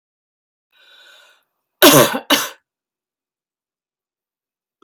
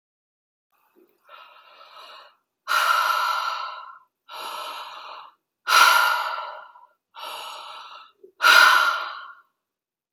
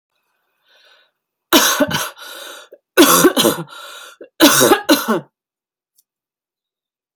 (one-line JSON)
{"cough_length": "4.8 s", "cough_amplitude": 32768, "cough_signal_mean_std_ratio": 0.24, "exhalation_length": "10.1 s", "exhalation_amplitude": 27228, "exhalation_signal_mean_std_ratio": 0.42, "three_cough_length": "7.2 s", "three_cough_amplitude": 32768, "three_cough_signal_mean_std_ratio": 0.4, "survey_phase": "alpha (2021-03-01 to 2021-08-12)", "age": "45-64", "gender": "Female", "wearing_mask": "No", "symptom_none": true, "smoker_status": "Never smoked", "respiratory_condition_asthma": false, "respiratory_condition_other": false, "recruitment_source": "REACT", "submission_delay": "2 days", "covid_test_result": "Negative", "covid_test_method": "RT-qPCR"}